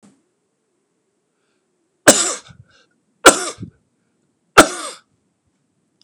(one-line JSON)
{"three_cough_length": "6.0 s", "three_cough_amplitude": 32768, "three_cough_signal_mean_std_ratio": 0.21, "survey_phase": "beta (2021-08-13 to 2022-03-07)", "age": "65+", "gender": "Male", "wearing_mask": "No", "symptom_none": true, "smoker_status": "Current smoker (1 to 10 cigarettes per day)", "respiratory_condition_asthma": false, "respiratory_condition_other": false, "recruitment_source": "REACT", "submission_delay": "2 days", "covid_test_result": "Negative", "covid_test_method": "RT-qPCR", "influenza_a_test_result": "Negative", "influenza_b_test_result": "Negative"}